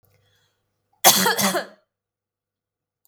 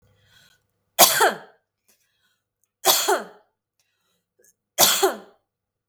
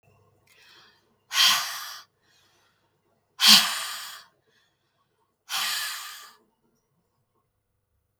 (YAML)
cough_length: 3.1 s
cough_amplitude: 32768
cough_signal_mean_std_ratio: 0.31
three_cough_length: 5.9 s
three_cough_amplitude: 32768
three_cough_signal_mean_std_ratio: 0.31
exhalation_length: 8.2 s
exhalation_amplitude: 32766
exhalation_signal_mean_std_ratio: 0.29
survey_phase: beta (2021-08-13 to 2022-03-07)
age: 45-64
gender: Female
wearing_mask: 'No'
symptom_none: true
smoker_status: Never smoked
respiratory_condition_asthma: false
respiratory_condition_other: false
recruitment_source: Test and Trace
submission_delay: 1 day
covid_test_result: Negative
covid_test_method: RT-qPCR